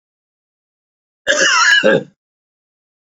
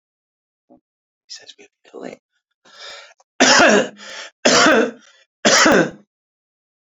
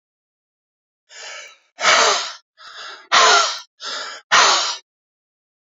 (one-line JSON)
{"cough_length": "3.1 s", "cough_amplitude": 28868, "cough_signal_mean_std_ratio": 0.41, "three_cough_length": "6.8 s", "three_cough_amplitude": 32019, "three_cough_signal_mean_std_ratio": 0.39, "exhalation_length": "5.6 s", "exhalation_amplitude": 32624, "exhalation_signal_mean_std_ratio": 0.43, "survey_phase": "beta (2021-08-13 to 2022-03-07)", "age": "45-64", "gender": "Male", "wearing_mask": "No", "symptom_none": true, "smoker_status": "Ex-smoker", "respiratory_condition_asthma": false, "respiratory_condition_other": false, "recruitment_source": "REACT", "submission_delay": "1 day", "covid_test_result": "Negative", "covid_test_method": "RT-qPCR", "influenza_a_test_result": "Negative", "influenza_b_test_result": "Negative"}